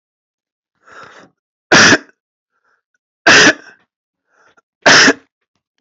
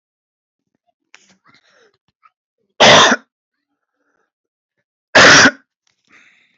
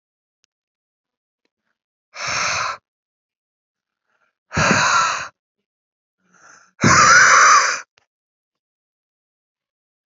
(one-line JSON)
{"three_cough_length": "5.8 s", "three_cough_amplitude": 32768, "three_cough_signal_mean_std_ratio": 0.34, "cough_length": "6.6 s", "cough_amplitude": 32690, "cough_signal_mean_std_ratio": 0.29, "exhalation_length": "10.1 s", "exhalation_amplitude": 29716, "exhalation_signal_mean_std_ratio": 0.36, "survey_phase": "alpha (2021-03-01 to 2021-08-12)", "age": "18-44", "gender": "Male", "wearing_mask": "No", "symptom_cough_any": true, "symptom_fatigue": true, "symptom_onset": "3 days", "smoker_status": "Never smoked", "respiratory_condition_asthma": false, "respiratory_condition_other": false, "recruitment_source": "Test and Trace", "submission_delay": "2 days", "covid_test_result": "Positive", "covid_test_method": "RT-qPCR"}